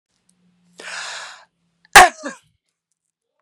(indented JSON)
{
  "cough_length": "3.4 s",
  "cough_amplitude": 32768,
  "cough_signal_mean_std_ratio": 0.2,
  "survey_phase": "beta (2021-08-13 to 2022-03-07)",
  "age": "45-64",
  "gender": "Female",
  "wearing_mask": "No",
  "symptom_cough_any": true,
  "symptom_shortness_of_breath": true,
  "symptom_sore_throat": true,
  "symptom_abdominal_pain": true,
  "symptom_headache": true,
  "symptom_onset": "2 days",
  "smoker_status": "Ex-smoker",
  "respiratory_condition_asthma": false,
  "respiratory_condition_other": false,
  "recruitment_source": "Test and Trace",
  "submission_delay": "1 day",
  "covid_test_result": "Positive",
  "covid_test_method": "ePCR"
}